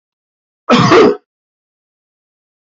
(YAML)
cough_length: 2.7 s
cough_amplitude: 30471
cough_signal_mean_std_ratio: 0.36
survey_phase: beta (2021-08-13 to 2022-03-07)
age: 65+
gender: Male
wearing_mask: 'No'
symptom_none: true
smoker_status: Ex-smoker
respiratory_condition_asthma: true
respiratory_condition_other: false
recruitment_source: REACT
submission_delay: 1 day
covid_test_result: Negative
covid_test_method: RT-qPCR